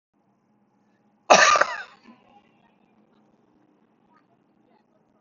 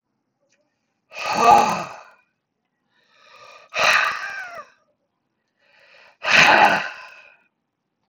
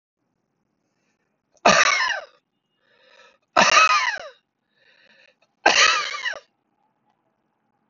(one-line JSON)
{"cough_length": "5.2 s", "cough_amplitude": 28692, "cough_signal_mean_std_ratio": 0.22, "exhalation_length": "8.1 s", "exhalation_amplitude": 30592, "exhalation_signal_mean_std_ratio": 0.35, "three_cough_length": "7.9 s", "three_cough_amplitude": 27995, "three_cough_signal_mean_std_ratio": 0.35, "survey_phase": "beta (2021-08-13 to 2022-03-07)", "age": "65+", "gender": "Male", "wearing_mask": "No", "symptom_headache": true, "smoker_status": "Never smoked", "respiratory_condition_asthma": false, "respiratory_condition_other": false, "recruitment_source": "REACT", "submission_delay": "1 day", "covid_test_result": "Negative", "covid_test_method": "RT-qPCR"}